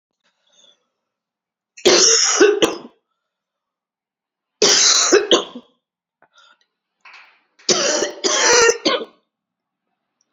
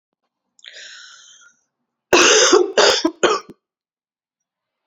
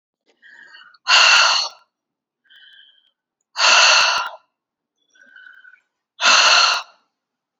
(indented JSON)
{
  "three_cough_length": "10.3 s",
  "three_cough_amplitude": 32439,
  "three_cough_signal_mean_std_ratio": 0.42,
  "cough_length": "4.9 s",
  "cough_amplitude": 30823,
  "cough_signal_mean_std_ratio": 0.38,
  "exhalation_length": "7.6 s",
  "exhalation_amplitude": 29499,
  "exhalation_signal_mean_std_ratio": 0.42,
  "survey_phase": "beta (2021-08-13 to 2022-03-07)",
  "age": "45-64",
  "gender": "Female",
  "wearing_mask": "No",
  "symptom_cough_any": true,
  "symptom_runny_or_blocked_nose": true,
  "symptom_fatigue": true,
  "symptom_headache": true,
  "symptom_change_to_sense_of_smell_or_taste": true,
  "symptom_onset": "6 days",
  "smoker_status": "Never smoked",
  "respiratory_condition_asthma": false,
  "respiratory_condition_other": false,
  "recruitment_source": "Test and Trace",
  "submission_delay": "2 days",
  "covid_test_result": "Positive",
  "covid_test_method": "RT-qPCR"
}